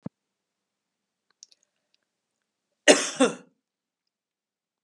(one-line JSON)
{"cough_length": "4.8 s", "cough_amplitude": 25465, "cough_signal_mean_std_ratio": 0.18, "survey_phase": "beta (2021-08-13 to 2022-03-07)", "age": "45-64", "gender": "Female", "wearing_mask": "No", "symptom_fatigue": true, "smoker_status": "Current smoker (e-cigarettes or vapes only)", "respiratory_condition_asthma": false, "respiratory_condition_other": false, "recruitment_source": "REACT", "submission_delay": "1 day", "covid_test_result": "Negative", "covid_test_method": "RT-qPCR", "influenza_a_test_result": "Negative", "influenza_b_test_result": "Negative"}